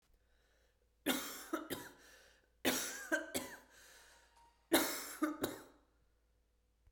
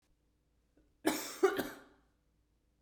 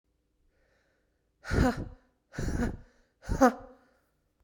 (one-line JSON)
{"three_cough_length": "6.9 s", "three_cough_amplitude": 5339, "three_cough_signal_mean_std_ratio": 0.41, "cough_length": "2.8 s", "cough_amplitude": 4935, "cough_signal_mean_std_ratio": 0.3, "exhalation_length": "4.4 s", "exhalation_amplitude": 12661, "exhalation_signal_mean_std_ratio": 0.35, "survey_phase": "beta (2021-08-13 to 2022-03-07)", "age": "18-44", "gender": "Female", "wearing_mask": "No", "symptom_runny_or_blocked_nose": true, "smoker_status": "Never smoked", "respiratory_condition_asthma": false, "respiratory_condition_other": false, "recruitment_source": "Test and Trace", "submission_delay": "2 days", "covid_test_result": "Positive", "covid_test_method": "ePCR"}